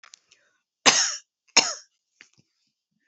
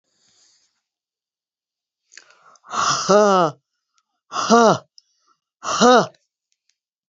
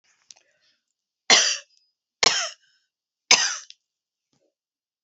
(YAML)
cough_length: 3.1 s
cough_amplitude: 30746
cough_signal_mean_std_ratio: 0.26
exhalation_length: 7.1 s
exhalation_amplitude: 30479
exhalation_signal_mean_std_ratio: 0.35
three_cough_length: 5.0 s
three_cough_amplitude: 32768
three_cough_signal_mean_std_ratio: 0.27
survey_phase: alpha (2021-03-01 to 2021-08-12)
age: 65+
gender: Female
wearing_mask: 'No'
symptom_none: true
smoker_status: Never smoked
respiratory_condition_asthma: false
respiratory_condition_other: false
recruitment_source: REACT
submission_delay: 2 days
covid_test_result: Negative
covid_test_method: RT-qPCR